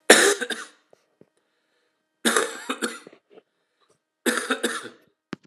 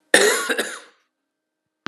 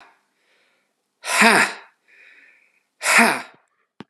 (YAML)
three_cough_length: 5.5 s
three_cough_amplitude: 32768
three_cough_signal_mean_std_ratio: 0.33
cough_length: 1.9 s
cough_amplitude: 32768
cough_signal_mean_std_ratio: 0.39
exhalation_length: 4.1 s
exhalation_amplitude: 32767
exhalation_signal_mean_std_ratio: 0.34
survey_phase: alpha (2021-03-01 to 2021-08-12)
age: 45-64
gender: Male
wearing_mask: 'No'
symptom_fatigue: true
smoker_status: Never smoked
respiratory_condition_asthma: false
respiratory_condition_other: false
recruitment_source: Test and Trace
submission_delay: 3 days
covid_test_result: Positive
covid_test_method: RT-qPCR
covid_ct_value: 18.3
covid_ct_gene: ORF1ab gene
covid_ct_mean: 18.4
covid_viral_load: 900000 copies/ml
covid_viral_load_category: Low viral load (10K-1M copies/ml)